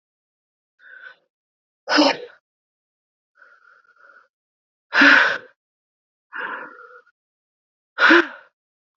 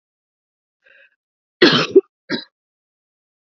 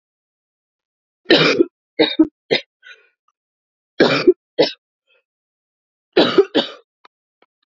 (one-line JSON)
{"exhalation_length": "9.0 s", "exhalation_amplitude": 28343, "exhalation_signal_mean_std_ratio": 0.28, "cough_length": "3.5 s", "cough_amplitude": 32768, "cough_signal_mean_std_ratio": 0.24, "three_cough_length": "7.7 s", "three_cough_amplitude": 32768, "three_cough_signal_mean_std_ratio": 0.32, "survey_phase": "beta (2021-08-13 to 2022-03-07)", "age": "18-44", "gender": "Female", "wearing_mask": "No", "symptom_runny_or_blocked_nose": true, "symptom_sore_throat": true, "symptom_fatigue": true, "symptom_headache": true, "symptom_onset": "2 days", "smoker_status": "Never smoked", "respiratory_condition_asthma": false, "respiratory_condition_other": false, "recruitment_source": "Test and Trace", "submission_delay": "1 day", "covid_test_result": "Positive", "covid_test_method": "RT-qPCR", "covid_ct_value": 21.0, "covid_ct_gene": "ORF1ab gene", "covid_ct_mean": 21.4, "covid_viral_load": "97000 copies/ml", "covid_viral_load_category": "Low viral load (10K-1M copies/ml)"}